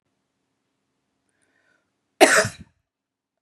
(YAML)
cough_length: 3.4 s
cough_amplitude: 32767
cough_signal_mean_std_ratio: 0.2
survey_phase: beta (2021-08-13 to 2022-03-07)
age: 45-64
gender: Female
wearing_mask: 'No'
symptom_cough_any: true
smoker_status: Never smoked
respiratory_condition_asthma: false
respiratory_condition_other: false
recruitment_source: REACT
submission_delay: 1 day
covid_test_result: Negative
covid_test_method: RT-qPCR